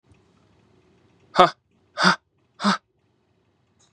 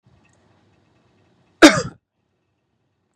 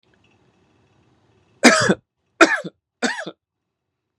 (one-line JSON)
{"exhalation_length": "3.9 s", "exhalation_amplitude": 32767, "exhalation_signal_mean_std_ratio": 0.24, "cough_length": "3.2 s", "cough_amplitude": 32768, "cough_signal_mean_std_ratio": 0.17, "three_cough_length": "4.2 s", "three_cough_amplitude": 32768, "three_cough_signal_mean_std_ratio": 0.28, "survey_phase": "beta (2021-08-13 to 2022-03-07)", "age": "18-44", "gender": "Male", "wearing_mask": "No", "symptom_none": true, "smoker_status": "Never smoked", "respiratory_condition_asthma": false, "respiratory_condition_other": false, "recruitment_source": "REACT", "submission_delay": "1 day", "covid_test_result": "Negative", "covid_test_method": "RT-qPCR", "influenza_a_test_result": "Negative", "influenza_b_test_result": "Negative"}